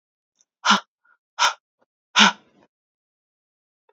{
  "exhalation_length": "3.9 s",
  "exhalation_amplitude": 31733,
  "exhalation_signal_mean_std_ratio": 0.25,
  "survey_phase": "beta (2021-08-13 to 2022-03-07)",
  "age": "18-44",
  "gender": "Female",
  "wearing_mask": "No",
  "symptom_runny_or_blocked_nose": true,
  "symptom_sore_throat": true,
  "symptom_fatigue": true,
  "symptom_fever_high_temperature": true,
  "symptom_headache": true,
  "smoker_status": "Never smoked",
  "respiratory_condition_asthma": false,
  "respiratory_condition_other": false,
  "recruitment_source": "Test and Trace",
  "submission_delay": "-1 day",
  "covid_test_result": "Positive",
  "covid_test_method": "LFT"
}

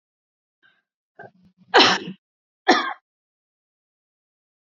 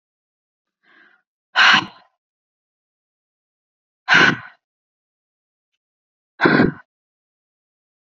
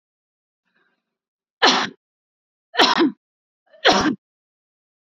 {
  "cough_length": "4.8 s",
  "cough_amplitude": 28134,
  "cough_signal_mean_std_ratio": 0.24,
  "exhalation_length": "8.2 s",
  "exhalation_amplitude": 30736,
  "exhalation_signal_mean_std_ratio": 0.25,
  "three_cough_length": "5.0 s",
  "three_cough_amplitude": 29007,
  "three_cough_signal_mean_std_ratio": 0.32,
  "survey_phase": "beta (2021-08-13 to 2022-03-07)",
  "age": "45-64",
  "gender": "Female",
  "wearing_mask": "No",
  "symptom_runny_or_blocked_nose": true,
  "symptom_fatigue": true,
  "symptom_headache": true,
  "symptom_onset": "12 days",
  "smoker_status": "Ex-smoker",
  "respiratory_condition_asthma": false,
  "respiratory_condition_other": false,
  "recruitment_source": "REACT",
  "submission_delay": "2 days",
  "covid_test_result": "Negative",
  "covid_test_method": "RT-qPCR",
  "influenza_a_test_result": "Negative",
  "influenza_b_test_result": "Negative"
}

